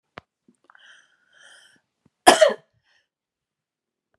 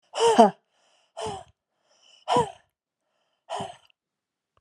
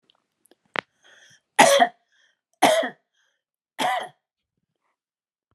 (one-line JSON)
{"cough_length": "4.2 s", "cough_amplitude": 32768, "cough_signal_mean_std_ratio": 0.18, "exhalation_length": "4.6 s", "exhalation_amplitude": 29526, "exhalation_signal_mean_std_ratio": 0.29, "three_cough_length": "5.5 s", "three_cough_amplitude": 30867, "three_cough_signal_mean_std_ratio": 0.28, "survey_phase": "beta (2021-08-13 to 2022-03-07)", "age": "45-64", "gender": "Female", "wearing_mask": "No", "symptom_runny_or_blocked_nose": true, "symptom_headache": true, "smoker_status": "Never smoked", "respiratory_condition_asthma": false, "respiratory_condition_other": false, "recruitment_source": "Test and Trace", "submission_delay": "1 day", "covid_test_result": "Positive", "covid_test_method": "RT-qPCR", "covid_ct_value": 21.3, "covid_ct_gene": "ORF1ab gene", "covid_ct_mean": 21.8, "covid_viral_load": "72000 copies/ml", "covid_viral_load_category": "Low viral load (10K-1M copies/ml)"}